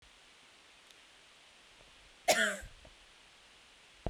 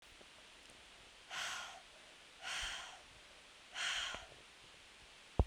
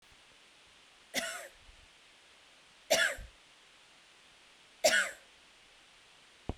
{"cough_length": "4.1 s", "cough_amplitude": 7364, "cough_signal_mean_std_ratio": 0.29, "exhalation_length": "5.5 s", "exhalation_amplitude": 5798, "exhalation_signal_mean_std_ratio": 0.47, "three_cough_length": "6.6 s", "three_cough_amplitude": 7160, "three_cough_signal_mean_std_ratio": 0.31, "survey_phase": "beta (2021-08-13 to 2022-03-07)", "age": "18-44", "gender": "Female", "wearing_mask": "No", "symptom_cough_any": true, "symptom_runny_or_blocked_nose": true, "symptom_fatigue": true, "symptom_headache": true, "symptom_change_to_sense_of_smell_or_taste": true, "symptom_loss_of_taste": true, "smoker_status": "Never smoked", "respiratory_condition_asthma": false, "respiratory_condition_other": false, "recruitment_source": "Test and Trace", "submission_delay": "1 day", "covid_test_result": "Positive", "covid_test_method": "RT-qPCR", "covid_ct_value": 15.2, "covid_ct_gene": "ORF1ab gene", "covid_ct_mean": 15.5, "covid_viral_load": "8100000 copies/ml", "covid_viral_load_category": "High viral load (>1M copies/ml)"}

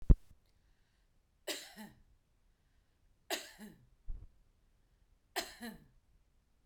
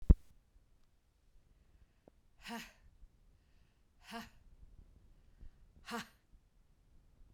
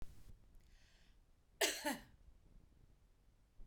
{"three_cough_length": "6.7 s", "three_cough_amplitude": 12170, "three_cough_signal_mean_std_ratio": 0.17, "exhalation_length": "7.3 s", "exhalation_amplitude": 11551, "exhalation_signal_mean_std_ratio": 0.15, "cough_length": "3.7 s", "cough_amplitude": 2856, "cough_signal_mean_std_ratio": 0.37, "survey_phase": "beta (2021-08-13 to 2022-03-07)", "age": "45-64", "gender": "Female", "wearing_mask": "No", "symptom_none": true, "smoker_status": "Ex-smoker", "respiratory_condition_asthma": false, "respiratory_condition_other": false, "recruitment_source": "REACT", "submission_delay": "1 day", "covid_test_result": "Negative", "covid_test_method": "RT-qPCR"}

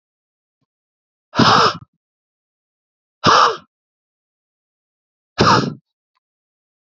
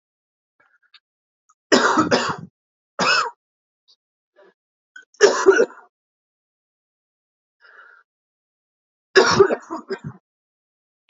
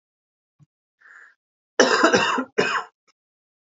{"exhalation_length": "7.0 s", "exhalation_amplitude": 31092, "exhalation_signal_mean_std_ratio": 0.3, "three_cough_length": "11.1 s", "three_cough_amplitude": 32353, "three_cough_signal_mean_std_ratio": 0.3, "cough_length": "3.7 s", "cough_amplitude": 27281, "cough_signal_mean_std_ratio": 0.38, "survey_phase": "beta (2021-08-13 to 2022-03-07)", "age": "18-44", "gender": "Male", "wearing_mask": "No", "symptom_cough_any": true, "symptom_onset": "7 days", "smoker_status": "Never smoked", "respiratory_condition_asthma": false, "respiratory_condition_other": false, "recruitment_source": "Test and Trace", "submission_delay": "2 days", "covid_test_result": "Positive", "covid_test_method": "RT-qPCR", "covid_ct_value": 21.4, "covid_ct_gene": "ORF1ab gene", "covid_ct_mean": 21.5, "covid_viral_load": "87000 copies/ml", "covid_viral_load_category": "Low viral load (10K-1M copies/ml)"}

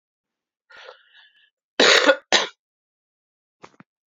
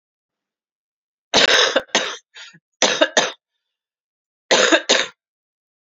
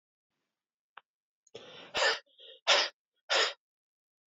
{"cough_length": "4.2 s", "cough_amplitude": 30920, "cough_signal_mean_std_ratio": 0.27, "three_cough_length": "5.9 s", "three_cough_amplitude": 32767, "three_cough_signal_mean_std_ratio": 0.38, "exhalation_length": "4.3 s", "exhalation_amplitude": 8282, "exhalation_signal_mean_std_ratio": 0.32, "survey_phase": "beta (2021-08-13 to 2022-03-07)", "age": "18-44", "gender": "Female", "wearing_mask": "No", "symptom_cough_any": true, "symptom_new_continuous_cough": true, "symptom_runny_or_blocked_nose": true, "symptom_shortness_of_breath": true, "symptom_sore_throat": true, "symptom_fatigue": true, "symptom_fever_high_temperature": true, "symptom_change_to_sense_of_smell_or_taste": true, "symptom_loss_of_taste": true, "symptom_onset": "3 days", "smoker_status": "Current smoker (e-cigarettes or vapes only)", "respiratory_condition_asthma": false, "respiratory_condition_other": false, "recruitment_source": "Test and Trace", "submission_delay": "2 days", "covid_test_result": "Positive", "covid_test_method": "RT-qPCR"}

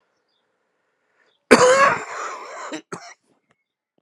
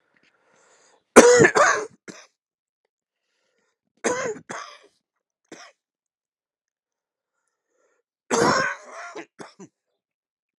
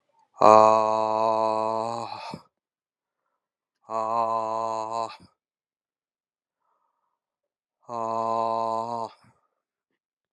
{"cough_length": "4.0 s", "cough_amplitude": 32768, "cough_signal_mean_std_ratio": 0.32, "three_cough_length": "10.6 s", "three_cough_amplitude": 32768, "three_cough_signal_mean_std_ratio": 0.26, "exhalation_length": "10.3 s", "exhalation_amplitude": 30151, "exhalation_signal_mean_std_ratio": 0.36, "survey_phase": "alpha (2021-03-01 to 2021-08-12)", "age": "45-64", "gender": "Male", "wearing_mask": "No", "symptom_cough_any": true, "symptom_fatigue": true, "symptom_headache": true, "symptom_change_to_sense_of_smell_or_taste": true, "symptom_onset": "2 days", "smoker_status": "Never smoked", "respiratory_condition_asthma": false, "respiratory_condition_other": false, "recruitment_source": "Test and Trace", "submission_delay": "2 days", "covid_test_result": "Positive", "covid_test_method": "RT-qPCR", "covid_ct_value": 15.4, "covid_ct_gene": "N gene", "covid_ct_mean": 15.5, "covid_viral_load": "8500000 copies/ml", "covid_viral_load_category": "High viral load (>1M copies/ml)"}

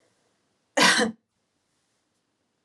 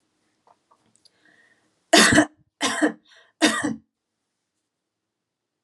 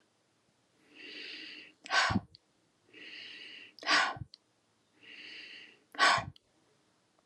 {"cough_length": "2.6 s", "cough_amplitude": 18075, "cough_signal_mean_std_ratio": 0.28, "three_cough_length": "5.6 s", "three_cough_amplitude": 30053, "three_cough_signal_mean_std_ratio": 0.29, "exhalation_length": "7.3 s", "exhalation_amplitude": 8051, "exhalation_signal_mean_std_ratio": 0.34, "survey_phase": "beta (2021-08-13 to 2022-03-07)", "age": "18-44", "gender": "Female", "wearing_mask": "No", "symptom_none": true, "smoker_status": "Never smoked", "respiratory_condition_asthma": false, "respiratory_condition_other": false, "recruitment_source": "REACT", "submission_delay": "3 days", "covid_test_result": "Negative", "covid_test_method": "RT-qPCR", "influenza_a_test_result": "Unknown/Void", "influenza_b_test_result": "Unknown/Void"}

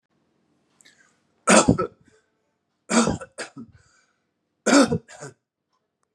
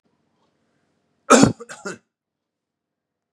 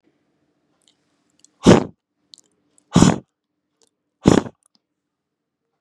{"three_cough_length": "6.1 s", "three_cough_amplitude": 29077, "three_cough_signal_mean_std_ratio": 0.3, "cough_length": "3.3 s", "cough_amplitude": 32768, "cough_signal_mean_std_ratio": 0.21, "exhalation_length": "5.8 s", "exhalation_amplitude": 32768, "exhalation_signal_mean_std_ratio": 0.21, "survey_phase": "beta (2021-08-13 to 2022-03-07)", "age": "45-64", "gender": "Male", "wearing_mask": "No", "symptom_none": true, "smoker_status": "Never smoked", "respiratory_condition_asthma": false, "respiratory_condition_other": false, "recruitment_source": "Test and Trace", "submission_delay": "0 days", "covid_test_result": "Negative", "covid_test_method": "LFT"}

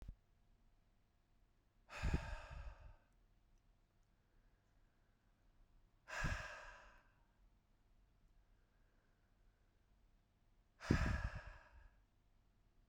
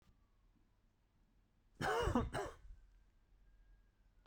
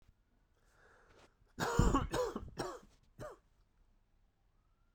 {"exhalation_length": "12.9 s", "exhalation_amplitude": 3340, "exhalation_signal_mean_std_ratio": 0.31, "cough_length": "4.3 s", "cough_amplitude": 2332, "cough_signal_mean_std_ratio": 0.36, "three_cough_length": "4.9 s", "three_cough_amplitude": 5588, "three_cough_signal_mean_std_ratio": 0.35, "survey_phase": "beta (2021-08-13 to 2022-03-07)", "age": "18-44", "gender": "Male", "wearing_mask": "No", "symptom_cough_any": true, "symptom_sore_throat": true, "symptom_diarrhoea": true, "symptom_fatigue": true, "symptom_fever_high_temperature": true, "symptom_headache": true, "smoker_status": "Ex-smoker", "respiratory_condition_asthma": false, "respiratory_condition_other": false, "recruitment_source": "Test and Trace", "submission_delay": "2 days", "covid_test_result": "Positive", "covid_test_method": "RT-qPCR", "covid_ct_value": 27.1, "covid_ct_gene": "N gene"}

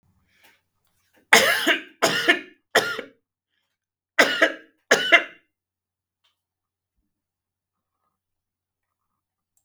{"cough_length": "9.6 s", "cough_amplitude": 32768, "cough_signal_mean_std_ratio": 0.29, "survey_phase": "beta (2021-08-13 to 2022-03-07)", "age": "45-64", "gender": "Male", "wearing_mask": "No", "symptom_shortness_of_breath": true, "symptom_fatigue": true, "symptom_onset": "12 days", "smoker_status": "Never smoked", "respiratory_condition_asthma": false, "respiratory_condition_other": false, "recruitment_source": "REACT", "submission_delay": "1 day", "covid_test_result": "Negative", "covid_test_method": "RT-qPCR", "influenza_a_test_result": "Negative", "influenza_b_test_result": "Negative"}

